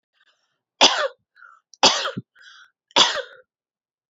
{"three_cough_length": "4.1 s", "three_cough_amplitude": 31472, "three_cough_signal_mean_std_ratio": 0.31, "survey_phase": "beta (2021-08-13 to 2022-03-07)", "age": "18-44", "gender": "Female", "wearing_mask": "No", "symptom_cough_any": true, "symptom_runny_or_blocked_nose": true, "symptom_fever_high_temperature": true, "symptom_other": true, "symptom_onset": "3 days", "smoker_status": "Never smoked", "respiratory_condition_asthma": false, "respiratory_condition_other": false, "recruitment_source": "Test and Trace", "submission_delay": "1 day", "covid_test_result": "Positive", "covid_test_method": "RT-qPCR", "covid_ct_value": 35.9, "covid_ct_gene": "N gene"}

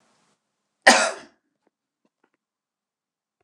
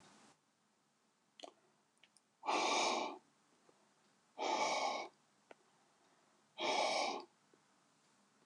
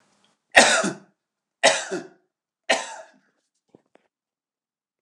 {"cough_length": "3.4 s", "cough_amplitude": 29204, "cough_signal_mean_std_ratio": 0.19, "exhalation_length": "8.5 s", "exhalation_amplitude": 2336, "exhalation_signal_mean_std_ratio": 0.43, "three_cough_length": "5.0 s", "three_cough_amplitude": 29204, "three_cough_signal_mean_std_ratio": 0.28, "survey_phase": "alpha (2021-03-01 to 2021-08-12)", "age": "65+", "gender": "Male", "wearing_mask": "No", "symptom_none": true, "smoker_status": "Ex-smoker", "respiratory_condition_asthma": false, "respiratory_condition_other": false, "recruitment_source": "REACT", "submission_delay": "1 day", "covid_test_result": "Negative", "covid_test_method": "RT-qPCR"}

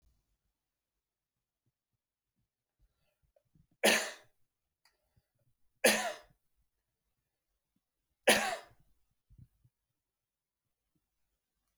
{"three_cough_length": "11.8 s", "three_cough_amplitude": 11468, "three_cough_signal_mean_std_ratio": 0.19, "survey_phase": "beta (2021-08-13 to 2022-03-07)", "age": "45-64", "gender": "Male", "wearing_mask": "No", "symptom_none": true, "symptom_onset": "12 days", "smoker_status": "Never smoked", "respiratory_condition_asthma": false, "respiratory_condition_other": false, "recruitment_source": "REACT", "submission_delay": "2 days", "covid_test_result": "Negative", "covid_test_method": "RT-qPCR"}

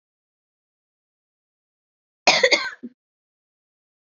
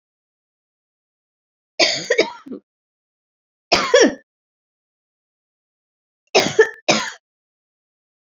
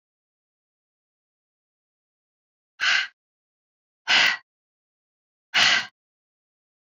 {"cough_length": "4.2 s", "cough_amplitude": 30539, "cough_signal_mean_std_ratio": 0.22, "three_cough_length": "8.4 s", "three_cough_amplitude": 31030, "three_cough_signal_mean_std_ratio": 0.28, "exhalation_length": "6.8 s", "exhalation_amplitude": 17897, "exhalation_signal_mean_std_ratio": 0.27, "survey_phase": "beta (2021-08-13 to 2022-03-07)", "age": "18-44", "gender": "Female", "wearing_mask": "No", "symptom_cough_any": true, "symptom_runny_or_blocked_nose": true, "symptom_sore_throat": true, "symptom_onset": "4 days", "smoker_status": "Ex-smoker", "respiratory_condition_asthma": false, "respiratory_condition_other": false, "recruitment_source": "Test and Trace", "submission_delay": "2 days", "covid_test_result": "Positive", "covid_test_method": "RT-qPCR", "covid_ct_value": 16.3, "covid_ct_gene": "ORF1ab gene", "covid_ct_mean": 17.0, "covid_viral_load": "2700000 copies/ml", "covid_viral_load_category": "High viral load (>1M copies/ml)"}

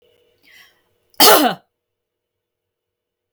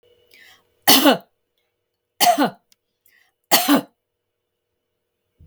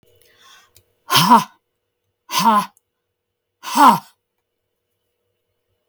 {"cough_length": "3.3 s", "cough_amplitude": 32768, "cough_signal_mean_std_ratio": 0.25, "three_cough_length": "5.5 s", "three_cough_amplitude": 32768, "three_cough_signal_mean_std_ratio": 0.31, "exhalation_length": "5.9 s", "exhalation_amplitude": 32766, "exhalation_signal_mean_std_ratio": 0.31, "survey_phase": "beta (2021-08-13 to 2022-03-07)", "age": "45-64", "gender": "Female", "wearing_mask": "No", "symptom_none": true, "smoker_status": "Never smoked", "respiratory_condition_asthma": false, "respiratory_condition_other": false, "recruitment_source": "REACT", "submission_delay": "2 days", "covid_test_result": "Negative", "covid_test_method": "RT-qPCR"}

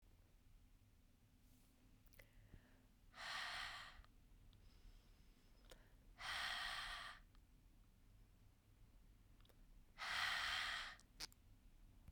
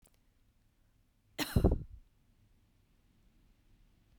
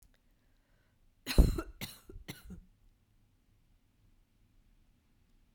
{"exhalation_length": "12.1 s", "exhalation_amplitude": 984, "exhalation_signal_mean_std_ratio": 0.53, "cough_length": "4.2 s", "cough_amplitude": 6855, "cough_signal_mean_std_ratio": 0.23, "three_cough_length": "5.5 s", "three_cough_amplitude": 9458, "three_cough_signal_mean_std_ratio": 0.19, "survey_phase": "beta (2021-08-13 to 2022-03-07)", "age": "45-64", "gender": "Female", "wearing_mask": "No", "symptom_cough_any": true, "symptom_new_continuous_cough": true, "symptom_runny_or_blocked_nose": true, "symptom_shortness_of_breath": true, "symptom_fatigue": true, "symptom_fever_high_temperature": true, "symptom_headache": true, "symptom_change_to_sense_of_smell_or_taste": true, "symptom_other": true, "symptom_onset": "3 days", "smoker_status": "Never smoked", "respiratory_condition_asthma": false, "respiratory_condition_other": false, "recruitment_source": "Test and Trace", "submission_delay": "2 days", "covid_test_result": "Positive", "covid_test_method": "RT-qPCR", "covid_ct_value": 13.9, "covid_ct_gene": "ORF1ab gene", "covid_ct_mean": 14.2, "covid_viral_load": "22000000 copies/ml", "covid_viral_load_category": "High viral load (>1M copies/ml)"}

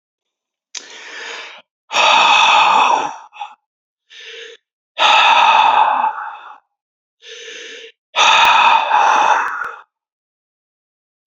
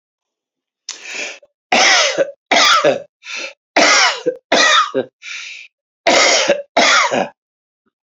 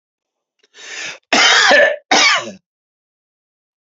{"exhalation_length": "11.3 s", "exhalation_amplitude": 31838, "exhalation_signal_mean_std_ratio": 0.54, "three_cough_length": "8.1 s", "three_cough_amplitude": 32767, "three_cough_signal_mean_std_ratio": 0.56, "cough_length": "3.9 s", "cough_amplitude": 31078, "cough_signal_mean_std_ratio": 0.44, "survey_phase": "beta (2021-08-13 to 2022-03-07)", "age": "45-64", "gender": "Male", "wearing_mask": "No", "symptom_none": true, "smoker_status": "Ex-smoker", "respiratory_condition_asthma": false, "respiratory_condition_other": false, "recruitment_source": "REACT", "submission_delay": "4 days", "covid_test_result": "Negative", "covid_test_method": "RT-qPCR", "influenza_a_test_result": "Negative", "influenza_b_test_result": "Negative"}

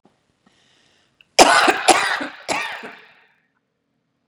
{"three_cough_length": "4.3 s", "three_cough_amplitude": 32768, "three_cough_signal_mean_std_ratio": 0.34, "survey_phase": "beta (2021-08-13 to 2022-03-07)", "age": "18-44", "gender": "Female", "wearing_mask": "No", "symptom_none": true, "smoker_status": "Never smoked", "respiratory_condition_asthma": false, "respiratory_condition_other": false, "recruitment_source": "REACT", "submission_delay": "1 day", "covid_test_result": "Negative", "covid_test_method": "RT-qPCR"}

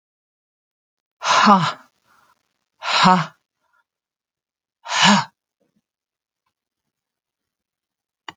{"exhalation_length": "8.4 s", "exhalation_amplitude": 30371, "exhalation_signal_mean_std_ratio": 0.29, "survey_phase": "alpha (2021-03-01 to 2021-08-12)", "age": "65+", "gender": "Female", "wearing_mask": "No", "symptom_none": true, "smoker_status": "Ex-smoker", "respiratory_condition_asthma": false, "respiratory_condition_other": false, "recruitment_source": "REACT", "submission_delay": "1 day", "covid_test_result": "Negative", "covid_test_method": "RT-qPCR"}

